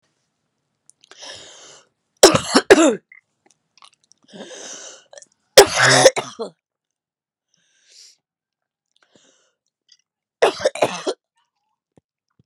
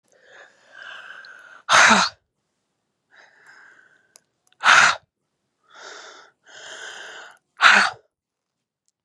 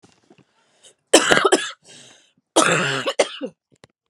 three_cough_length: 12.5 s
three_cough_amplitude: 32768
three_cough_signal_mean_std_ratio: 0.25
exhalation_length: 9.0 s
exhalation_amplitude: 32029
exhalation_signal_mean_std_ratio: 0.29
cough_length: 4.1 s
cough_amplitude: 32768
cough_signal_mean_std_ratio: 0.39
survey_phase: beta (2021-08-13 to 2022-03-07)
age: 18-44
gender: Female
wearing_mask: 'No'
symptom_cough_any: true
symptom_shortness_of_breath: true
symptom_sore_throat: true
symptom_fatigue: true
symptom_headache: true
symptom_change_to_sense_of_smell_or_taste: true
symptom_onset: 4 days
smoker_status: Never smoked
respiratory_condition_asthma: true
respiratory_condition_other: false
recruitment_source: Test and Trace
submission_delay: 1 day
covid_test_result: Positive
covid_test_method: RT-qPCR
covid_ct_value: 16.9
covid_ct_gene: N gene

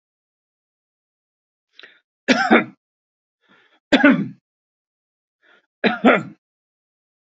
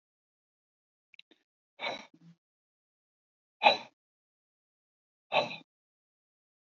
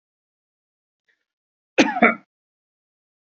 three_cough_length: 7.3 s
three_cough_amplitude: 27940
three_cough_signal_mean_std_ratio: 0.27
exhalation_length: 6.7 s
exhalation_amplitude: 15342
exhalation_signal_mean_std_ratio: 0.18
cough_length: 3.2 s
cough_amplitude: 28553
cough_signal_mean_std_ratio: 0.21
survey_phase: beta (2021-08-13 to 2022-03-07)
age: 45-64
gender: Male
wearing_mask: 'No'
symptom_none: true
smoker_status: Never smoked
respiratory_condition_asthma: false
respiratory_condition_other: false
recruitment_source: REACT
submission_delay: 1 day
covid_test_result: Negative
covid_test_method: RT-qPCR
influenza_a_test_result: Negative
influenza_b_test_result: Negative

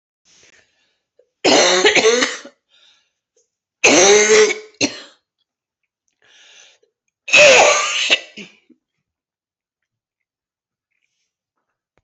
three_cough_length: 12.0 s
three_cough_amplitude: 32042
three_cough_signal_mean_std_ratio: 0.38
survey_phase: alpha (2021-03-01 to 2021-08-12)
age: 45-64
gender: Female
wearing_mask: 'No'
symptom_cough_any: true
symptom_new_continuous_cough: true
symptom_shortness_of_breath: true
symptom_abdominal_pain: true
symptom_fatigue: true
symptom_fever_high_temperature: true
symptom_headache: true
symptom_onset: 3 days
smoker_status: Never smoked
respiratory_condition_asthma: false
respiratory_condition_other: false
recruitment_source: Test and Trace
submission_delay: 2 days
covid_test_result: Positive
covid_test_method: RT-qPCR
covid_ct_value: 24.8
covid_ct_gene: ORF1ab gene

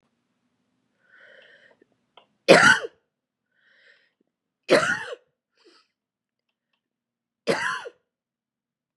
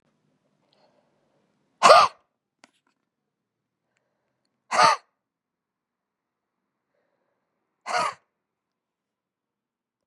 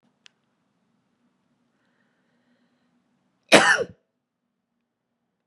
three_cough_length: 9.0 s
three_cough_amplitude: 29926
three_cough_signal_mean_std_ratio: 0.23
exhalation_length: 10.1 s
exhalation_amplitude: 30775
exhalation_signal_mean_std_ratio: 0.18
cough_length: 5.5 s
cough_amplitude: 32409
cough_signal_mean_std_ratio: 0.17
survey_phase: beta (2021-08-13 to 2022-03-07)
age: 18-44
gender: Female
wearing_mask: 'No'
symptom_cough_any: true
symptom_new_continuous_cough: true
symptom_runny_or_blocked_nose: true
symptom_shortness_of_breath: true
symptom_diarrhoea: true
symptom_fatigue: true
symptom_change_to_sense_of_smell_or_taste: true
symptom_loss_of_taste: true
symptom_onset: 2 days
smoker_status: Never smoked
respiratory_condition_asthma: false
respiratory_condition_other: false
recruitment_source: Test and Trace
submission_delay: 2 days
covid_test_result: Positive
covid_test_method: RT-qPCR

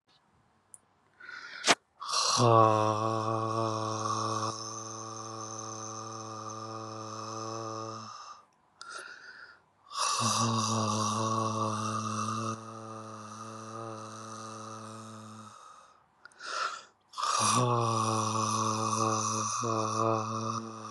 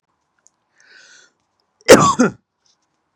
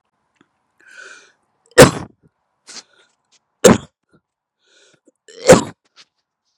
exhalation_length: 20.9 s
exhalation_amplitude: 17719
exhalation_signal_mean_std_ratio: 0.69
cough_length: 3.2 s
cough_amplitude: 32768
cough_signal_mean_std_ratio: 0.25
three_cough_length: 6.6 s
three_cough_amplitude: 32768
three_cough_signal_mean_std_ratio: 0.21
survey_phase: beta (2021-08-13 to 2022-03-07)
age: 18-44
gender: Male
wearing_mask: 'No'
symptom_none: true
smoker_status: Never smoked
respiratory_condition_asthma: false
respiratory_condition_other: false
recruitment_source: REACT
submission_delay: 1 day
covid_test_result: Negative
covid_test_method: RT-qPCR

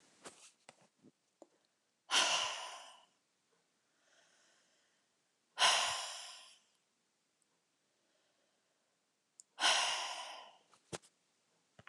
exhalation_length: 11.9 s
exhalation_amplitude: 5378
exhalation_signal_mean_std_ratio: 0.31
survey_phase: beta (2021-08-13 to 2022-03-07)
age: 65+
gender: Female
wearing_mask: 'No'
symptom_none: true
smoker_status: Ex-smoker
respiratory_condition_asthma: false
respiratory_condition_other: false
recruitment_source: REACT
submission_delay: 1 day
covid_test_result: Negative
covid_test_method: RT-qPCR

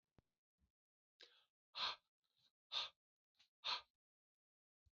exhalation_length: 4.9 s
exhalation_amplitude: 994
exhalation_signal_mean_std_ratio: 0.26
survey_phase: beta (2021-08-13 to 2022-03-07)
age: 45-64
gender: Male
wearing_mask: 'No'
symptom_runny_or_blocked_nose: true
symptom_sore_throat: true
symptom_headache: true
symptom_onset: 3 days
smoker_status: Ex-smoker
respiratory_condition_asthma: false
respiratory_condition_other: false
recruitment_source: Test and Trace
submission_delay: 2 days
covid_test_result: Positive
covid_test_method: RT-qPCR
covid_ct_value: 20.0
covid_ct_gene: N gene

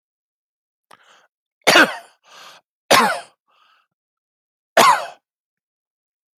three_cough_length: 6.4 s
three_cough_amplitude: 31909
three_cough_signal_mean_std_ratio: 0.27
survey_phase: alpha (2021-03-01 to 2021-08-12)
age: 45-64
gender: Male
wearing_mask: 'No'
symptom_none: true
smoker_status: Ex-smoker
respiratory_condition_asthma: false
respiratory_condition_other: false
recruitment_source: REACT
submission_delay: 1 day
covid_test_result: Negative
covid_test_method: RT-qPCR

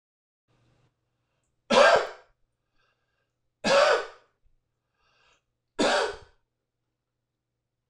three_cough_length: 7.9 s
three_cough_amplitude: 18398
three_cough_signal_mean_std_ratio: 0.29
survey_phase: alpha (2021-03-01 to 2021-08-12)
age: 45-64
gender: Male
wearing_mask: 'No'
symptom_none: true
smoker_status: Ex-smoker
respiratory_condition_asthma: false
respiratory_condition_other: false
recruitment_source: REACT
submission_delay: 2 days
covid_test_result: Negative
covid_test_method: RT-qPCR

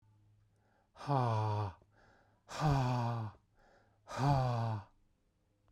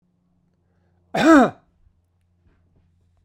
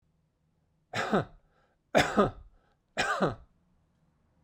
exhalation_length: 5.7 s
exhalation_amplitude: 4081
exhalation_signal_mean_std_ratio: 0.56
cough_length: 3.2 s
cough_amplitude: 23689
cough_signal_mean_std_ratio: 0.26
three_cough_length: 4.4 s
three_cough_amplitude: 12009
three_cough_signal_mean_std_ratio: 0.36
survey_phase: beta (2021-08-13 to 2022-03-07)
age: 45-64
gender: Male
wearing_mask: 'No'
symptom_none: true
smoker_status: Never smoked
respiratory_condition_asthma: false
respiratory_condition_other: false
recruitment_source: REACT
submission_delay: 2 days
covid_test_result: Negative
covid_test_method: RT-qPCR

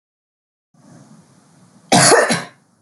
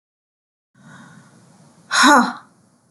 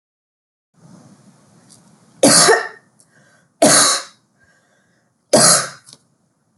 cough_length: 2.8 s
cough_amplitude: 32768
cough_signal_mean_std_ratio: 0.35
exhalation_length: 2.9 s
exhalation_amplitude: 30174
exhalation_signal_mean_std_ratio: 0.31
three_cough_length: 6.6 s
three_cough_amplitude: 32768
three_cough_signal_mean_std_ratio: 0.35
survey_phase: beta (2021-08-13 to 2022-03-07)
age: 18-44
gender: Female
wearing_mask: 'No'
symptom_none: true
smoker_status: Never smoked
respiratory_condition_asthma: false
respiratory_condition_other: false
recruitment_source: REACT
submission_delay: 5 days
covid_test_result: Negative
covid_test_method: RT-qPCR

